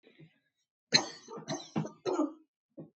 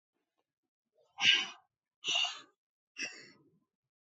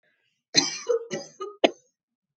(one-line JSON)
{"three_cough_length": "3.0 s", "three_cough_amplitude": 11562, "three_cough_signal_mean_std_ratio": 0.37, "exhalation_length": "4.2 s", "exhalation_amplitude": 8153, "exhalation_signal_mean_std_ratio": 0.3, "cough_length": "2.4 s", "cough_amplitude": 25058, "cough_signal_mean_std_ratio": 0.33, "survey_phase": "beta (2021-08-13 to 2022-03-07)", "age": "18-44", "gender": "Female", "wearing_mask": "No", "symptom_none": true, "smoker_status": "Never smoked", "respiratory_condition_asthma": false, "respiratory_condition_other": false, "recruitment_source": "REACT", "submission_delay": "3 days", "covid_test_result": "Negative", "covid_test_method": "RT-qPCR", "influenza_a_test_result": "Negative", "influenza_b_test_result": "Negative"}